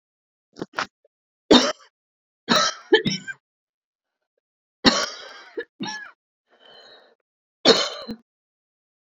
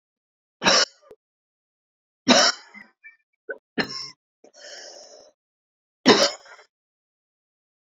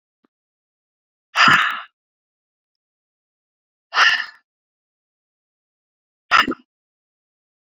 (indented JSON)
{
  "cough_length": "9.1 s",
  "cough_amplitude": 29449,
  "cough_signal_mean_std_ratio": 0.29,
  "three_cough_length": "7.9 s",
  "three_cough_amplitude": 29796,
  "three_cough_signal_mean_std_ratio": 0.27,
  "exhalation_length": "7.8 s",
  "exhalation_amplitude": 28650,
  "exhalation_signal_mean_std_ratio": 0.25,
  "survey_phase": "beta (2021-08-13 to 2022-03-07)",
  "age": "45-64",
  "gender": "Female",
  "wearing_mask": "No",
  "symptom_shortness_of_breath": true,
  "symptom_fatigue": true,
  "smoker_status": "Ex-smoker",
  "respiratory_condition_asthma": true,
  "respiratory_condition_other": true,
  "recruitment_source": "REACT",
  "submission_delay": "3 days",
  "covid_test_result": "Negative",
  "covid_test_method": "RT-qPCR"
}